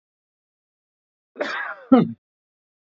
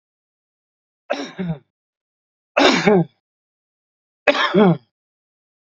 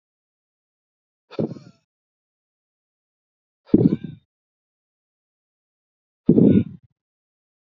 {
  "cough_length": "2.8 s",
  "cough_amplitude": 27226,
  "cough_signal_mean_std_ratio": 0.26,
  "three_cough_length": "5.6 s",
  "three_cough_amplitude": 32767,
  "three_cough_signal_mean_std_ratio": 0.35,
  "exhalation_length": "7.7 s",
  "exhalation_amplitude": 27398,
  "exhalation_signal_mean_std_ratio": 0.22,
  "survey_phase": "beta (2021-08-13 to 2022-03-07)",
  "age": "45-64",
  "gender": "Male",
  "wearing_mask": "No",
  "symptom_none": true,
  "smoker_status": "Ex-smoker",
  "respiratory_condition_asthma": true,
  "respiratory_condition_other": false,
  "recruitment_source": "REACT",
  "submission_delay": "1 day",
  "covid_test_result": "Negative",
  "covid_test_method": "RT-qPCR",
  "influenza_a_test_result": "Negative",
  "influenza_b_test_result": "Negative"
}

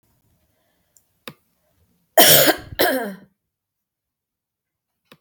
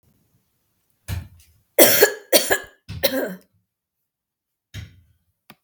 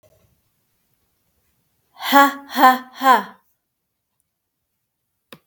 {
  "cough_length": "5.2 s",
  "cough_amplitude": 32767,
  "cough_signal_mean_std_ratio": 0.27,
  "three_cough_length": "5.6 s",
  "three_cough_amplitude": 32768,
  "three_cough_signal_mean_std_ratio": 0.3,
  "exhalation_length": "5.5 s",
  "exhalation_amplitude": 32768,
  "exhalation_signal_mean_std_ratio": 0.27,
  "survey_phase": "beta (2021-08-13 to 2022-03-07)",
  "age": "45-64",
  "gender": "Female",
  "wearing_mask": "No",
  "symptom_none": true,
  "smoker_status": "Never smoked",
  "respiratory_condition_asthma": false,
  "respiratory_condition_other": false,
  "recruitment_source": "REACT",
  "submission_delay": "11 days",
  "covid_test_result": "Negative",
  "covid_test_method": "RT-qPCR"
}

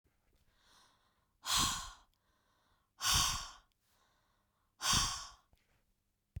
{
  "exhalation_length": "6.4 s",
  "exhalation_amplitude": 4126,
  "exhalation_signal_mean_std_ratio": 0.36,
  "survey_phase": "beta (2021-08-13 to 2022-03-07)",
  "age": "45-64",
  "gender": "Female",
  "wearing_mask": "No",
  "symptom_none": true,
  "symptom_onset": "11 days",
  "smoker_status": "Never smoked",
  "respiratory_condition_asthma": false,
  "respiratory_condition_other": false,
  "recruitment_source": "REACT",
  "submission_delay": "-1 day",
  "covid_test_result": "Negative",
  "covid_test_method": "RT-qPCR",
  "influenza_a_test_result": "Negative",
  "influenza_b_test_result": "Negative"
}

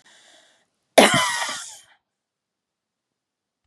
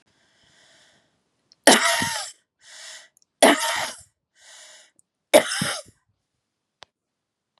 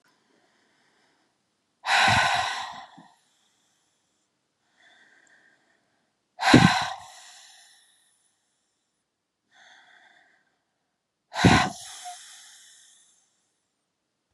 {
  "cough_length": "3.7 s",
  "cough_amplitude": 32768,
  "cough_signal_mean_std_ratio": 0.26,
  "three_cough_length": "7.6 s",
  "three_cough_amplitude": 32768,
  "three_cough_signal_mean_std_ratio": 0.29,
  "exhalation_length": "14.3 s",
  "exhalation_amplitude": 28403,
  "exhalation_signal_mean_std_ratio": 0.26,
  "survey_phase": "beta (2021-08-13 to 2022-03-07)",
  "age": "45-64",
  "gender": "Female",
  "wearing_mask": "No",
  "symptom_none": true,
  "smoker_status": "Never smoked",
  "respiratory_condition_asthma": false,
  "respiratory_condition_other": false,
  "recruitment_source": "REACT",
  "submission_delay": "1 day",
  "covid_test_result": "Negative",
  "covid_test_method": "RT-qPCR",
  "influenza_a_test_result": "Negative",
  "influenza_b_test_result": "Negative"
}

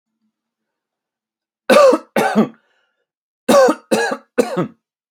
{
  "three_cough_length": "5.1 s",
  "three_cough_amplitude": 29504,
  "three_cough_signal_mean_std_ratio": 0.4,
  "survey_phase": "alpha (2021-03-01 to 2021-08-12)",
  "age": "18-44",
  "gender": "Male",
  "wearing_mask": "No",
  "symptom_none": true,
  "smoker_status": "Ex-smoker",
  "respiratory_condition_asthma": false,
  "respiratory_condition_other": false,
  "recruitment_source": "REACT",
  "submission_delay": "1 day",
  "covid_test_result": "Negative",
  "covid_test_method": "RT-qPCR"
}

